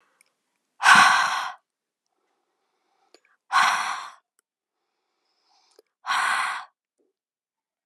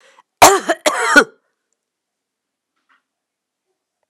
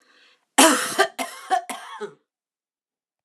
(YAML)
exhalation_length: 7.9 s
exhalation_amplitude: 28229
exhalation_signal_mean_std_ratio: 0.32
cough_length: 4.1 s
cough_amplitude: 32768
cough_signal_mean_std_ratio: 0.27
three_cough_length: 3.2 s
three_cough_amplitude: 30239
three_cough_signal_mean_std_ratio: 0.35
survey_phase: alpha (2021-03-01 to 2021-08-12)
age: 45-64
gender: Female
wearing_mask: 'No'
symptom_none: true
smoker_status: Never smoked
respiratory_condition_asthma: false
respiratory_condition_other: false
recruitment_source: REACT
submission_delay: 2 days
covid_test_result: Negative
covid_test_method: RT-qPCR